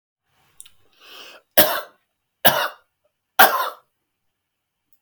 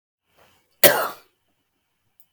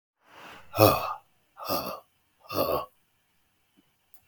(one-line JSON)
{"three_cough_length": "5.0 s", "three_cough_amplitude": 32768, "three_cough_signal_mean_std_ratio": 0.27, "cough_length": "2.3 s", "cough_amplitude": 32767, "cough_signal_mean_std_ratio": 0.22, "exhalation_length": "4.3 s", "exhalation_amplitude": 29149, "exhalation_signal_mean_std_ratio": 0.33, "survey_phase": "beta (2021-08-13 to 2022-03-07)", "age": "45-64", "gender": "Male", "wearing_mask": "No", "symptom_none": true, "smoker_status": "Current smoker (11 or more cigarettes per day)", "respiratory_condition_asthma": false, "respiratory_condition_other": false, "recruitment_source": "REACT", "submission_delay": "1 day", "covid_test_result": "Negative", "covid_test_method": "RT-qPCR", "influenza_a_test_result": "Negative", "influenza_b_test_result": "Negative"}